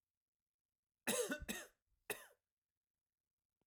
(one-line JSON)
{"cough_length": "3.7 s", "cough_amplitude": 1831, "cough_signal_mean_std_ratio": 0.3, "survey_phase": "alpha (2021-03-01 to 2021-08-12)", "age": "45-64", "gender": "Male", "wearing_mask": "No", "symptom_none": true, "smoker_status": "Never smoked", "respiratory_condition_asthma": false, "respiratory_condition_other": false, "recruitment_source": "REACT", "submission_delay": "2 days", "covid_test_result": "Negative", "covid_test_method": "RT-qPCR"}